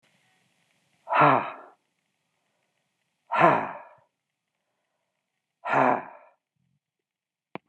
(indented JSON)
{
  "exhalation_length": "7.7 s",
  "exhalation_amplitude": 24442,
  "exhalation_signal_mean_std_ratio": 0.29,
  "survey_phase": "beta (2021-08-13 to 2022-03-07)",
  "age": "65+",
  "gender": "Male",
  "wearing_mask": "No",
  "symptom_none": true,
  "symptom_onset": "12 days",
  "smoker_status": "Never smoked",
  "respiratory_condition_asthma": false,
  "respiratory_condition_other": false,
  "recruitment_source": "REACT",
  "submission_delay": "2 days",
  "covid_test_result": "Negative",
  "covid_test_method": "RT-qPCR"
}